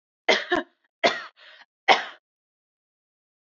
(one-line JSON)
{"three_cough_length": "3.5 s", "three_cough_amplitude": 26643, "three_cough_signal_mean_std_ratio": 0.28, "survey_phase": "beta (2021-08-13 to 2022-03-07)", "age": "18-44", "gender": "Female", "wearing_mask": "No", "symptom_none": true, "smoker_status": "Never smoked", "respiratory_condition_asthma": false, "respiratory_condition_other": false, "recruitment_source": "REACT", "submission_delay": "1 day", "covid_test_result": "Negative", "covid_test_method": "RT-qPCR"}